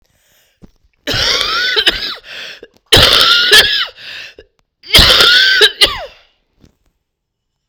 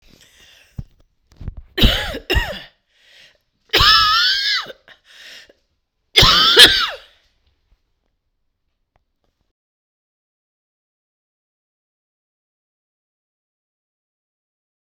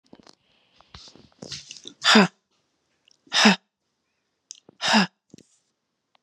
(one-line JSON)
{"cough_length": "7.7 s", "cough_amplitude": 32768, "cough_signal_mean_std_ratio": 0.52, "three_cough_length": "14.8 s", "three_cough_amplitude": 32768, "three_cough_signal_mean_std_ratio": 0.29, "exhalation_length": "6.2 s", "exhalation_amplitude": 28804, "exhalation_signal_mean_std_ratio": 0.27, "survey_phase": "beta (2021-08-13 to 2022-03-07)", "age": "45-64", "gender": "Female", "wearing_mask": "No", "symptom_cough_any": true, "symptom_runny_or_blocked_nose": true, "symptom_sore_throat": true, "symptom_headache": true, "symptom_change_to_sense_of_smell_or_taste": true, "symptom_loss_of_taste": true, "symptom_onset": "2 days", "smoker_status": "Never smoked", "respiratory_condition_asthma": false, "respiratory_condition_other": false, "recruitment_source": "Test and Trace", "submission_delay": "1 day", "covid_test_result": "Positive", "covid_test_method": "ePCR"}